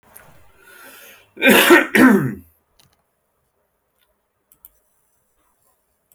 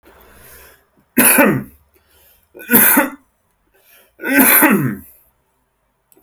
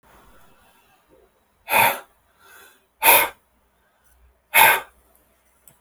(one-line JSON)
{"cough_length": "6.1 s", "cough_amplitude": 30779, "cough_signal_mean_std_ratio": 0.3, "three_cough_length": "6.2 s", "three_cough_amplitude": 32768, "three_cough_signal_mean_std_ratio": 0.42, "exhalation_length": "5.8 s", "exhalation_amplitude": 32768, "exhalation_signal_mean_std_ratio": 0.29, "survey_phase": "alpha (2021-03-01 to 2021-08-12)", "age": "18-44", "gender": "Male", "wearing_mask": "No", "symptom_none": true, "smoker_status": "Current smoker (1 to 10 cigarettes per day)", "respiratory_condition_asthma": false, "respiratory_condition_other": false, "recruitment_source": "REACT", "submission_delay": "1 day", "covid_test_result": "Negative", "covid_test_method": "RT-qPCR"}